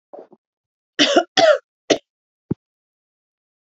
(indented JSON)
{
  "cough_length": "3.7 s",
  "cough_amplitude": 29607,
  "cough_signal_mean_std_ratio": 0.3,
  "survey_phase": "alpha (2021-03-01 to 2021-08-12)",
  "age": "18-44",
  "gender": "Female",
  "wearing_mask": "No",
  "symptom_none": true,
  "smoker_status": "Never smoked",
  "respiratory_condition_asthma": true,
  "respiratory_condition_other": false,
  "recruitment_source": "REACT",
  "submission_delay": "1 day",
  "covid_test_result": "Negative",
  "covid_test_method": "RT-qPCR"
}